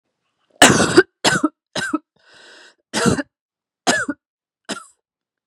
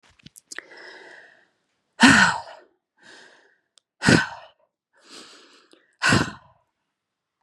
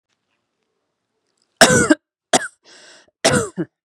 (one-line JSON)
{"cough_length": "5.5 s", "cough_amplitude": 32768, "cough_signal_mean_std_ratio": 0.35, "exhalation_length": "7.4 s", "exhalation_amplitude": 32767, "exhalation_signal_mean_std_ratio": 0.27, "three_cough_length": "3.8 s", "three_cough_amplitude": 32768, "three_cough_signal_mean_std_ratio": 0.31, "survey_phase": "beta (2021-08-13 to 2022-03-07)", "age": "18-44", "gender": "Female", "wearing_mask": "No", "symptom_cough_any": true, "symptom_runny_or_blocked_nose": true, "symptom_sore_throat": true, "symptom_fatigue": true, "symptom_headache": true, "symptom_change_to_sense_of_smell_or_taste": true, "symptom_onset": "4 days", "smoker_status": "Never smoked", "respiratory_condition_asthma": false, "respiratory_condition_other": false, "recruitment_source": "Test and Trace", "submission_delay": "2 days", "covid_test_result": "Positive", "covid_test_method": "RT-qPCR", "covid_ct_value": 24.8, "covid_ct_gene": "N gene"}